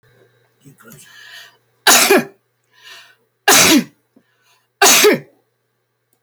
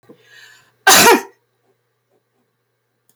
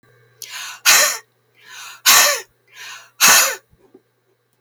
three_cough_length: 6.2 s
three_cough_amplitude: 32768
three_cough_signal_mean_std_ratio: 0.37
cough_length: 3.2 s
cough_amplitude: 32768
cough_signal_mean_std_ratio: 0.29
exhalation_length: 4.6 s
exhalation_amplitude: 32768
exhalation_signal_mean_std_ratio: 0.4
survey_phase: beta (2021-08-13 to 2022-03-07)
age: 65+
gender: Female
wearing_mask: 'No'
symptom_none: true
smoker_status: Ex-smoker
respiratory_condition_asthma: false
respiratory_condition_other: false
recruitment_source: REACT
submission_delay: 11 days
covid_test_result: Negative
covid_test_method: RT-qPCR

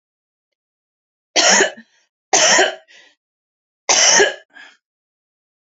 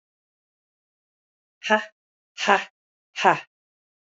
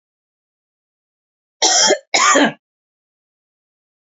three_cough_length: 5.7 s
three_cough_amplitude: 32722
three_cough_signal_mean_std_ratio: 0.38
exhalation_length: 4.1 s
exhalation_amplitude: 25838
exhalation_signal_mean_std_ratio: 0.25
cough_length: 4.0 s
cough_amplitude: 32768
cough_signal_mean_std_ratio: 0.35
survey_phase: alpha (2021-03-01 to 2021-08-12)
age: 45-64
gender: Female
wearing_mask: 'No'
symptom_diarrhoea: true
symptom_fatigue: true
symptom_headache: true
smoker_status: Never smoked
respiratory_condition_asthma: false
respiratory_condition_other: false
recruitment_source: Test and Trace
submission_delay: 1 day
covid_test_result: Positive
covid_test_method: RT-qPCR
covid_ct_value: 38.4
covid_ct_gene: N gene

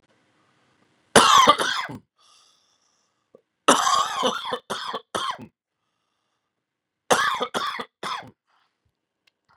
three_cough_length: 9.6 s
three_cough_amplitude: 32768
three_cough_signal_mean_std_ratio: 0.35
survey_phase: beta (2021-08-13 to 2022-03-07)
age: 18-44
gender: Male
wearing_mask: 'No'
symptom_cough_any: true
symptom_sore_throat: true
symptom_fatigue: true
symptom_headache: true
smoker_status: Never smoked
respiratory_condition_asthma: false
respiratory_condition_other: false
recruitment_source: Test and Trace
submission_delay: 2 days
covid_test_result: Positive
covid_test_method: LFT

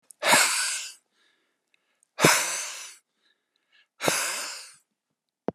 exhalation_length: 5.5 s
exhalation_amplitude: 23538
exhalation_signal_mean_std_ratio: 0.4
survey_phase: beta (2021-08-13 to 2022-03-07)
age: 65+
gender: Male
wearing_mask: 'No'
symptom_none: true
smoker_status: Ex-smoker
respiratory_condition_asthma: false
respiratory_condition_other: false
recruitment_source: REACT
submission_delay: 1 day
covid_test_result: Negative
covid_test_method: RT-qPCR
influenza_a_test_result: Negative
influenza_b_test_result: Negative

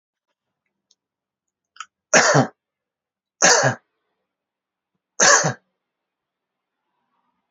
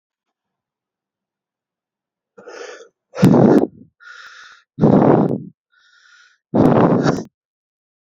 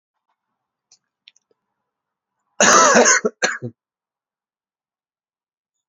three_cough_length: 7.5 s
three_cough_amplitude: 32717
three_cough_signal_mean_std_ratio: 0.28
exhalation_length: 8.1 s
exhalation_amplitude: 32768
exhalation_signal_mean_std_ratio: 0.38
cough_length: 5.9 s
cough_amplitude: 32768
cough_signal_mean_std_ratio: 0.29
survey_phase: beta (2021-08-13 to 2022-03-07)
age: 18-44
gender: Male
wearing_mask: 'No'
symptom_cough_any: true
symptom_sore_throat: true
symptom_abdominal_pain: true
symptom_fatigue: true
symptom_fever_high_temperature: true
symptom_headache: true
symptom_onset: 3 days
smoker_status: Never smoked
respiratory_condition_asthma: false
respiratory_condition_other: false
recruitment_source: Test and Trace
submission_delay: 2 days
covid_test_result: Positive
covid_test_method: RT-qPCR
covid_ct_value: 16.2
covid_ct_gene: ORF1ab gene
covid_ct_mean: 17.6
covid_viral_load: 1700000 copies/ml
covid_viral_load_category: High viral load (>1M copies/ml)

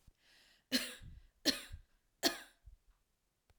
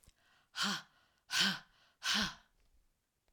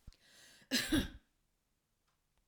three_cough_length: 3.6 s
three_cough_amplitude: 5430
three_cough_signal_mean_std_ratio: 0.29
exhalation_length: 3.3 s
exhalation_amplitude: 6371
exhalation_signal_mean_std_ratio: 0.4
cough_length: 2.5 s
cough_amplitude: 3030
cough_signal_mean_std_ratio: 0.32
survey_phase: alpha (2021-03-01 to 2021-08-12)
age: 45-64
gender: Female
wearing_mask: 'No'
symptom_none: true
smoker_status: Ex-smoker
respiratory_condition_asthma: false
respiratory_condition_other: false
recruitment_source: REACT
submission_delay: 1 day
covid_test_result: Negative
covid_test_method: RT-qPCR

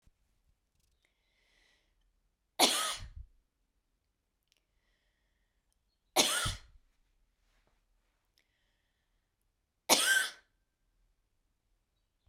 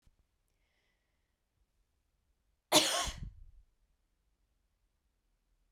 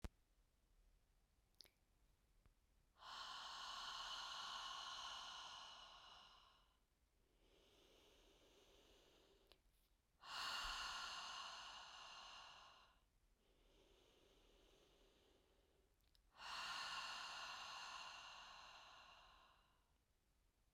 three_cough_length: 12.3 s
three_cough_amplitude: 12267
three_cough_signal_mean_std_ratio: 0.24
cough_length: 5.7 s
cough_amplitude: 9701
cough_signal_mean_std_ratio: 0.21
exhalation_length: 20.7 s
exhalation_amplitude: 455
exhalation_signal_mean_std_ratio: 0.6
survey_phase: beta (2021-08-13 to 2022-03-07)
age: 18-44
gender: Female
wearing_mask: 'No'
symptom_none: true
symptom_onset: 6 days
smoker_status: Ex-smoker
respiratory_condition_asthma: false
respiratory_condition_other: false
recruitment_source: REACT
submission_delay: 5 days
covid_test_result: Negative
covid_test_method: RT-qPCR
influenza_a_test_result: Unknown/Void
influenza_b_test_result: Unknown/Void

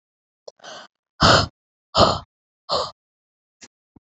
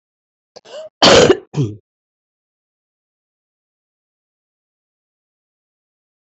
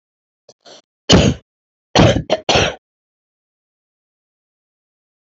exhalation_length: 4.0 s
exhalation_amplitude: 27426
exhalation_signal_mean_std_ratio: 0.31
cough_length: 6.2 s
cough_amplitude: 32167
cough_signal_mean_std_ratio: 0.23
three_cough_length: 5.2 s
three_cough_amplitude: 31374
three_cough_signal_mean_std_ratio: 0.31
survey_phase: alpha (2021-03-01 to 2021-08-12)
age: 45-64
gender: Female
wearing_mask: 'No'
symptom_cough_any: true
symptom_shortness_of_breath: true
symptom_fatigue: true
symptom_fever_high_temperature: true
symptom_headache: true
symptom_change_to_sense_of_smell_or_taste: true
symptom_onset: 3 days
smoker_status: Current smoker (e-cigarettes or vapes only)
respiratory_condition_asthma: true
respiratory_condition_other: false
recruitment_source: Test and Trace
submission_delay: 2 days
covid_test_result: Positive
covid_test_method: RT-qPCR
covid_ct_value: 11.5
covid_ct_gene: ORF1ab gene
covid_ct_mean: 11.9
covid_viral_load: 120000000 copies/ml
covid_viral_load_category: High viral load (>1M copies/ml)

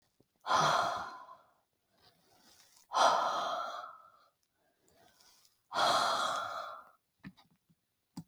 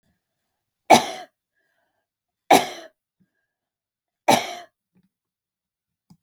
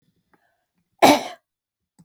exhalation_length: 8.3 s
exhalation_amplitude: 6476
exhalation_signal_mean_std_ratio: 0.45
three_cough_length: 6.2 s
three_cough_amplitude: 32768
three_cough_signal_mean_std_ratio: 0.2
cough_length: 2.0 s
cough_amplitude: 32768
cough_signal_mean_std_ratio: 0.24
survey_phase: beta (2021-08-13 to 2022-03-07)
age: 45-64
gender: Female
wearing_mask: 'No'
symptom_none: true
smoker_status: Never smoked
respiratory_condition_asthma: false
respiratory_condition_other: false
recruitment_source: REACT
submission_delay: 2 days
covid_test_result: Negative
covid_test_method: RT-qPCR
influenza_a_test_result: Negative
influenza_b_test_result: Negative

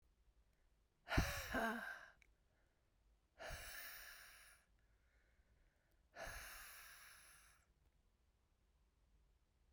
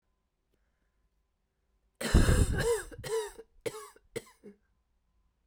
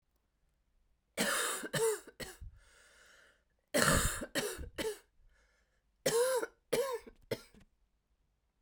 exhalation_length: 9.7 s
exhalation_amplitude: 2727
exhalation_signal_mean_std_ratio: 0.36
cough_length: 5.5 s
cough_amplitude: 11797
cough_signal_mean_std_ratio: 0.34
three_cough_length: 8.6 s
three_cough_amplitude: 8031
three_cough_signal_mean_std_ratio: 0.45
survey_phase: beta (2021-08-13 to 2022-03-07)
age: 45-64
gender: Female
wearing_mask: 'No'
symptom_cough_any: true
symptom_runny_or_blocked_nose: true
symptom_fatigue: true
symptom_change_to_sense_of_smell_or_taste: true
symptom_loss_of_taste: true
symptom_onset: 6 days
smoker_status: Ex-smoker
respiratory_condition_asthma: false
respiratory_condition_other: false
recruitment_source: Test and Trace
submission_delay: 2 days
covid_test_result: Positive
covid_test_method: RT-qPCR
covid_ct_value: 18.1
covid_ct_gene: ORF1ab gene
covid_ct_mean: 18.4
covid_viral_load: 950000 copies/ml
covid_viral_load_category: Low viral load (10K-1M copies/ml)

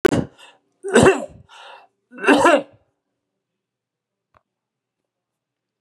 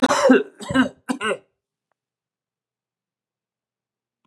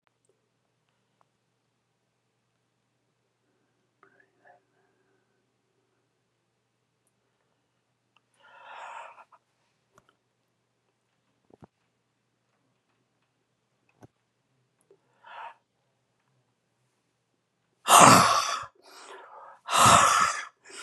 three_cough_length: 5.8 s
three_cough_amplitude: 32583
three_cough_signal_mean_std_ratio: 0.29
cough_length: 4.3 s
cough_amplitude: 25848
cough_signal_mean_std_ratio: 0.32
exhalation_length: 20.8 s
exhalation_amplitude: 29810
exhalation_signal_mean_std_ratio: 0.2
survey_phase: beta (2021-08-13 to 2022-03-07)
age: 65+
gender: Male
wearing_mask: 'No'
symptom_none: true
smoker_status: Never smoked
respiratory_condition_asthma: false
respiratory_condition_other: false
recruitment_source: REACT
submission_delay: 61 days
covid_test_result: Negative
covid_test_method: RT-qPCR
influenza_a_test_result: Negative
influenza_b_test_result: Negative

